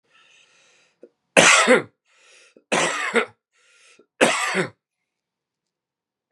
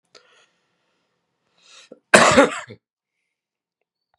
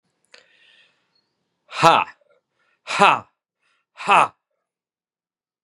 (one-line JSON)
{"three_cough_length": "6.3 s", "three_cough_amplitude": 32767, "three_cough_signal_mean_std_ratio": 0.34, "cough_length": "4.2 s", "cough_amplitude": 32768, "cough_signal_mean_std_ratio": 0.23, "exhalation_length": "5.6 s", "exhalation_amplitude": 32768, "exhalation_signal_mean_std_ratio": 0.25, "survey_phase": "beta (2021-08-13 to 2022-03-07)", "age": "45-64", "gender": "Male", "wearing_mask": "No", "symptom_cough_any": true, "symptom_runny_or_blocked_nose": true, "symptom_sore_throat": true, "symptom_fatigue": true, "symptom_onset": "5 days", "smoker_status": "Never smoked", "respiratory_condition_asthma": false, "respiratory_condition_other": false, "recruitment_source": "Test and Trace", "submission_delay": "2 days", "covid_test_result": "Positive", "covid_test_method": "RT-qPCR", "covid_ct_value": 25.5, "covid_ct_gene": "ORF1ab gene"}